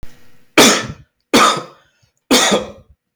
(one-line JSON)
{"three_cough_length": "3.2 s", "three_cough_amplitude": 32723, "three_cough_signal_mean_std_ratio": 0.47, "survey_phase": "beta (2021-08-13 to 2022-03-07)", "age": "45-64", "gender": "Male", "wearing_mask": "No", "symptom_none": true, "smoker_status": "Never smoked", "respiratory_condition_asthma": false, "respiratory_condition_other": false, "recruitment_source": "REACT", "submission_delay": "0 days", "covid_test_result": "Negative", "covid_test_method": "RT-qPCR", "influenza_a_test_result": "Negative", "influenza_b_test_result": "Negative"}